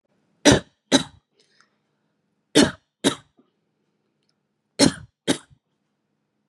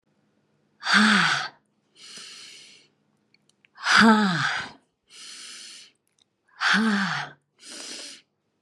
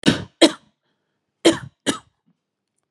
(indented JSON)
{
  "three_cough_length": "6.5 s",
  "three_cough_amplitude": 32255,
  "three_cough_signal_mean_std_ratio": 0.24,
  "exhalation_length": "8.6 s",
  "exhalation_amplitude": 23811,
  "exhalation_signal_mean_std_ratio": 0.41,
  "cough_length": "2.9 s",
  "cough_amplitude": 32669,
  "cough_signal_mean_std_ratio": 0.27,
  "survey_phase": "beta (2021-08-13 to 2022-03-07)",
  "age": "45-64",
  "gender": "Female",
  "wearing_mask": "Yes",
  "symptom_none": true,
  "smoker_status": "Never smoked",
  "respiratory_condition_asthma": false,
  "respiratory_condition_other": false,
  "recruitment_source": "REACT",
  "submission_delay": "4 days",
  "covid_test_result": "Negative",
  "covid_test_method": "RT-qPCR",
  "influenza_a_test_result": "Negative",
  "influenza_b_test_result": "Negative"
}